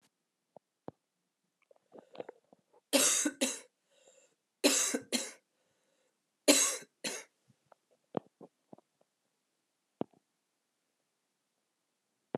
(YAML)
three_cough_length: 12.4 s
three_cough_amplitude: 10667
three_cough_signal_mean_std_ratio: 0.26
survey_phase: alpha (2021-03-01 to 2021-08-12)
age: 45-64
gender: Female
wearing_mask: 'No'
symptom_new_continuous_cough: true
symptom_fatigue: true
symptom_fever_high_temperature: true
symptom_change_to_sense_of_smell_or_taste: true
symptom_onset: 2 days
smoker_status: Current smoker (e-cigarettes or vapes only)
respiratory_condition_asthma: true
respiratory_condition_other: false
recruitment_source: Test and Trace
submission_delay: 1 day
covid_test_result: Positive
covid_test_method: RT-qPCR
covid_ct_value: 16.7
covid_ct_gene: ORF1ab gene
covid_ct_mean: 17.6
covid_viral_load: 1700000 copies/ml
covid_viral_load_category: High viral load (>1M copies/ml)